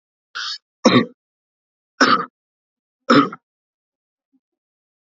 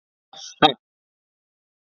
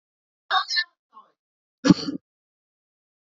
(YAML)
three_cough_length: 5.1 s
three_cough_amplitude: 31069
three_cough_signal_mean_std_ratio: 0.28
exhalation_length: 1.9 s
exhalation_amplitude: 27501
exhalation_signal_mean_std_ratio: 0.17
cough_length: 3.3 s
cough_amplitude: 27004
cough_signal_mean_std_ratio: 0.25
survey_phase: beta (2021-08-13 to 2022-03-07)
age: 18-44
gender: Male
wearing_mask: 'No'
symptom_none: true
smoker_status: Ex-smoker
respiratory_condition_asthma: true
respiratory_condition_other: false
recruitment_source: REACT
submission_delay: 0 days
covid_test_result: Negative
covid_test_method: RT-qPCR
influenza_a_test_result: Negative
influenza_b_test_result: Negative